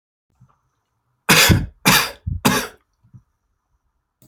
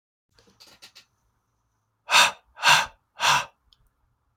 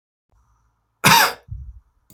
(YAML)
three_cough_length: 4.3 s
three_cough_amplitude: 32768
three_cough_signal_mean_std_ratio: 0.36
exhalation_length: 4.4 s
exhalation_amplitude: 24954
exhalation_signal_mean_std_ratio: 0.3
cough_length: 2.1 s
cough_amplitude: 32767
cough_signal_mean_std_ratio: 0.31
survey_phase: beta (2021-08-13 to 2022-03-07)
age: 18-44
gender: Male
wearing_mask: 'No'
symptom_runny_or_blocked_nose: true
symptom_sore_throat: true
symptom_onset: 3 days
smoker_status: Never smoked
respiratory_condition_asthma: false
respiratory_condition_other: false
recruitment_source: REACT
submission_delay: 3 days
covid_test_result: Negative
covid_test_method: RT-qPCR
influenza_a_test_result: Negative
influenza_b_test_result: Negative